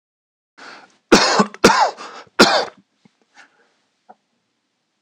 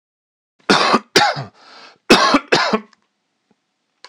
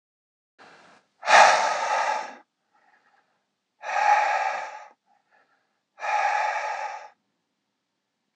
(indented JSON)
{
  "three_cough_length": "5.0 s",
  "three_cough_amplitude": 26028,
  "three_cough_signal_mean_std_ratio": 0.33,
  "cough_length": "4.1 s",
  "cough_amplitude": 26028,
  "cough_signal_mean_std_ratio": 0.41,
  "exhalation_length": "8.4 s",
  "exhalation_amplitude": 25541,
  "exhalation_signal_mean_std_ratio": 0.42,
  "survey_phase": "alpha (2021-03-01 to 2021-08-12)",
  "age": "45-64",
  "gender": "Male",
  "wearing_mask": "No",
  "symptom_none": true,
  "smoker_status": "Ex-smoker",
  "respiratory_condition_asthma": false,
  "respiratory_condition_other": false,
  "recruitment_source": "REACT",
  "submission_delay": "1 day",
  "covid_test_result": "Negative",
  "covid_test_method": "RT-qPCR"
}